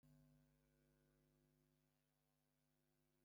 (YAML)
three_cough_length: 3.2 s
three_cough_amplitude: 23
three_cough_signal_mean_std_ratio: 0.78
survey_phase: beta (2021-08-13 to 2022-03-07)
age: 65+
gender: Male
wearing_mask: 'No'
symptom_none: true
smoker_status: Ex-smoker
respiratory_condition_asthma: false
respiratory_condition_other: false
recruitment_source: REACT
submission_delay: 2 days
covid_test_result: Negative
covid_test_method: RT-qPCR
influenza_a_test_result: Negative
influenza_b_test_result: Negative